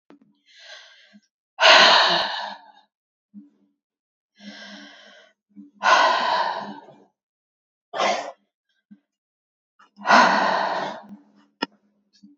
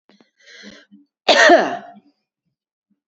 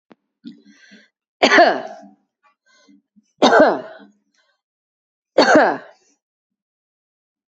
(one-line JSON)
{"exhalation_length": "12.4 s", "exhalation_amplitude": 28945, "exhalation_signal_mean_std_ratio": 0.37, "cough_length": "3.1 s", "cough_amplitude": 28746, "cough_signal_mean_std_ratio": 0.32, "three_cough_length": "7.5 s", "three_cough_amplitude": 32478, "three_cough_signal_mean_std_ratio": 0.31, "survey_phase": "beta (2021-08-13 to 2022-03-07)", "age": "45-64", "gender": "Female", "wearing_mask": "No", "symptom_none": true, "symptom_onset": "12 days", "smoker_status": "Never smoked", "respiratory_condition_asthma": false, "respiratory_condition_other": false, "recruitment_source": "REACT", "submission_delay": "1 day", "covid_test_result": "Negative", "covid_test_method": "RT-qPCR", "influenza_a_test_result": "Negative", "influenza_b_test_result": "Negative"}